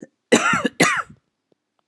{"cough_length": "1.9 s", "cough_amplitude": 30473, "cough_signal_mean_std_ratio": 0.43, "survey_phase": "beta (2021-08-13 to 2022-03-07)", "age": "45-64", "gender": "Female", "wearing_mask": "No", "symptom_cough_any": true, "symptom_runny_or_blocked_nose": true, "symptom_fatigue": true, "symptom_fever_high_temperature": true, "symptom_headache": true, "symptom_other": true, "smoker_status": "Ex-smoker", "respiratory_condition_asthma": false, "respiratory_condition_other": false, "recruitment_source": "Test and Trace", "submission_delay": "1 day", "covid_test_result": "Positive", "covid_test_method": "RT-qPCR"}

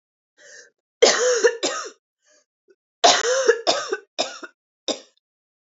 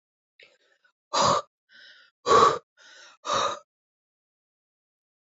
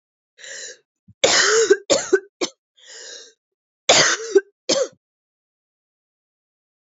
{"three_cough_length": "5.7 s", "three_cough_amplitude": 27598, "three_cough_signal_mean_std_ratio": 0.41, "exhalation_length": "5.4 s", "exhalation_amplitude": 16503, "exhalation_signal_mean_std_ratio": 0.31, "cough_length": "6.8 s", "cough_amplitude": 29806, "cough_signal_mean_std_ratio": 0.37, "survey_phase": "alpha (2021-03-01 to 2021-08-12)", "age": "18-44", "gender": "Female", "wearing_mask": "No", "symptom_cough_any": true, "symptom_fatigue": true, "symptom_headache": true, "symptom_loss_of_taste": true, "smoker_status": "Ex-smoker", "respiratory_condition_asthma": false, "respiratory_condition_other": false, "recruitment_source": "Test and Trace", "submission_delay": "2 days", "covid_test_result": "Positive", "covid_test_method": "LFT"}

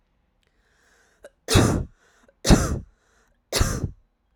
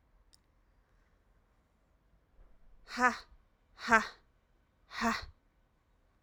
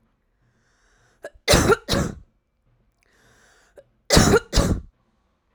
{"three_cough_length": "4.4 s", "three_cough_amplitude": 28270, "three_cough_signal_mean_std_ratio": 0.35, "exhalation_length": "6.2 s", "exhalation_amplitude": 11370, "exhalation_signal_mean_std_ratio": 0.24, "cough_length": "5.5 s", "cough_amplitude": 27077, "cough_signal_mean_std_ratio": 0.34, "survey_phase": "alpha (2021-03-01 to 2021-08-12)", "age": "18-44", "gender": "Female", "wearing_mask": "No", "symptom_fatigue": true, "symptom_headache": true, "symptom_change_to_sense_of_smell_or_taste": true, "symptom_onset": "6 days", "smoker_status": "Never smoked", "respiratory_condition_asthma": true, "respiratory_condition_other": false, "recruitment_source": "Test and Trace", "submission_delay": "1 day", "covid_test_result": "Positive", "covid_test_method": "RT-qPCR"}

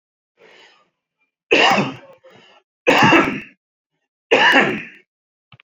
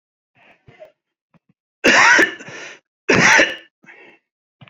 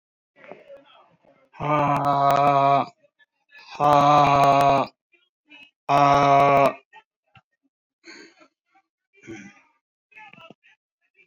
{"three_cough_length": "5.6 s", "three_cough_amplitude": 32768, "three_cough_signal_mean_std_ratio": 0.41, "cough_length": "4.7 s", "cough_amplitude": 29708, "cough_signal_mean_std_ratio": 0.38, "exhalation_length": "11.3 s", "exhalation_amplitude": 20901, "exhalation_signal_mean_std_ratio": 0.46, "survey_phase": "beta (2021-08-13 to 2022-03-07)", "age": "45-64", "gender": "Male", "wearing_mask": "No", "symptom_headache": true, "symptom_onset": "6 days", "smoker_status": "Never smoked", "respiratory_condition_asthma": false, "respiratory_condition_other": false, "recruitment_source": "REACT", "submission_delay": "1 day", "covid_test_result": "Negative", "covid_test_method": "RT-qPCR"}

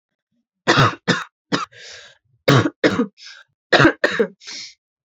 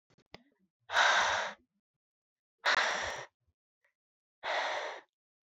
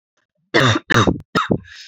{"three_cough_length": "5.1 s", "three_cough_amplitude": 30881, "three_cough_signal_mean_std_ratio": 0.41, "exhalation_length": "5.5 s", "exhalation_amplitude": 6804, "exhalation_signal_mean_std_ratio": 0.42, "cough_length": "1.9 s", "cough_amplitude": 28792, "cough_signal_mean_std_ratio": 0.51, "survey_phase": "alpha (2021-03-01 to 2021-08-12)", "age": "18-44", "gender": "Female", "wearing_mask": "No", "symptom_cough_any": true, "symptom_shortness_of_breath": true, "symptom_abdominal_pain": true, "symptom_fatigue": true, "symptom_fever_high_temperature": true, "symptom_headache": true, "symptom_change_to_sense_of_smell_or_taste": true, "symptom_loss_of_taste": true, "symptom_onset": "4 days", "smoker_status": "Never smoked", "respiratory_condition_asthma": false, "respiratory_condition_other": false, "recruitment_source": "Test and Trace", "submission_delay": "2 days", "covid_test_result": "Positive", "covid_test_method": "RT-qPCR", "covid_ct_value": 14.3, "covid_ct_gene": "ORF1ab gene", "covid_ct_mean": 14.8, "covid_viral_load": "14000000 copies/ml", "covid_viral_load_category": "High viral load (>1M copies/ml)"}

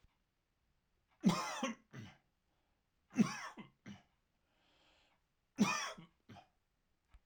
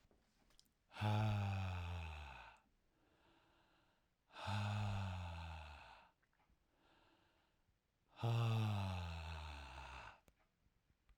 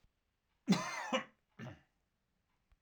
{"three_cough_length": "7.3 s", "three_cough_amplitude": 3574, "three_cough_signal_mean_std_ratio": 0.29, "exhalation_length": "11.2 s", "exhalation_amplitude": 1183, "exhalation_signal_mean_std_ratio": 0.57, "cough_length": "2.8 s", "cough_amplitude": 3749, "cough_signal_mean_std_ratio": 0.32, "survey_phase": "alpha (2021-03-01 to 2021-08-12)", "age": "45-64", "gender": "Male", "wearing_mask": "No", "symptom_fatigue": true, "smoker_status": "Never smoked", "respiratory_condition_asthma": false, "respiratory_condition_other": false, "recruitment_source": "REACT", "submission_delay": "1 day", "covid_test_result": "Negative", "covid_test_method": "RT-qPCR"}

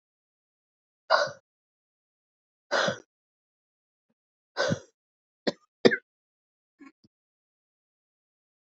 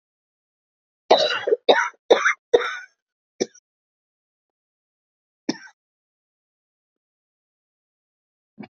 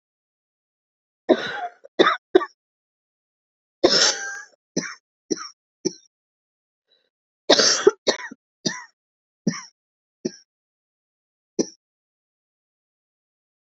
{"exhalation_length": "8.6 s", "exhalation_amplitude": 25739, "exhalation_signal_mean_std_ratio": 0.21, "cough_length": "8.8 s", "cough_amplitude": 27843, "cough_signal_mean_std_ratio": 0.24, "three_cough_length": "13.7 s", "three_cough_amplitude": 30709, "three_cough_signal_mean_std_ratio": 0.26, "survey_phase": "beta (2021-08-13 to 2022-03-07)", "age": "45-64", "gender": "Female", "wearing_mask": "Yes", "symptom_cough_any": true, "symptom_runny_or_blocked_nose": true, "symptom_sore_throat": true, "symptom_abdominal_pain": true, "symptom_fatigue": true, "symptom_fever_high_temperature": true, "symptom_headache": true, "symptom_change_to_sense_of_smell_or_taste": true, "symptom_onset": "3 days", "smoker_status": "Never smoked", "respiratory_condition_asthma": false, "respiratory_condition_other": false, "recruitment_source": "Test and Trace", "submission_delay": "2 days", "covid_test_result": "Positive", "covid_test_method": "RT-qPCR", "covid_ct_value": 25.0, "covid_ct_gene": "ORF1ab gene"}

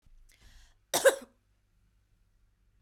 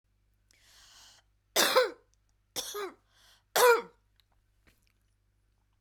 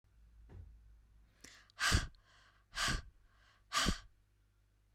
{"cough_length": "2.8 s", "cough_amplitude": 11839, "cough_signal_mean_std_ratio": 0.21, "three_cough_length": "5.8 s", "three_cough_amplitude": 10814, "three_cough_signal_mean_std_ratio": 0.28, "exhalation_length": "4.9 s", "exhalation_amplitude": 3999, "exhalation_signal_mean_std_ratio": 0.36, "survey_phase": "beta (2021-08-13 to 2022-03-07)", "age": "45-64", "gender": "Female", "wearing_mask": "No", "symptom_runny_or_blocked_nose": true, "symptom_headache": true, "smoker_status": "Never smoked", "respiratory_condition_asthma": false, "respiratory_condition_other": false, "recruitment_source": "REACT", "submission_delay": "1 day", "covid_test_result": "Negative", "covid_test_method": "RT-qPCR"}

